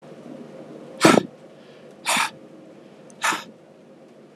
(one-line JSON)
{"exhalation_length": "4.4 s", "exhalation_amplitude": 32426, "exhalation_signal_mean_std_ratio": 0.34, "survey_phase": "alpha (2021-03-01 to 2021-08-12)", "age": "45-64", "gender": "Male", "wearing_mask": "No", "symptom_none": true, "symptom_onset": "4 days", "smoker_status": "Ex-smoker", "respiratory_condition_asthma": false, "respiratory_condition_other": false, "recruitment_source": "REACT", "submission_delay": "3 days", "covid_test_result": "Negative", "covid_test_method": "RT-qPCR"}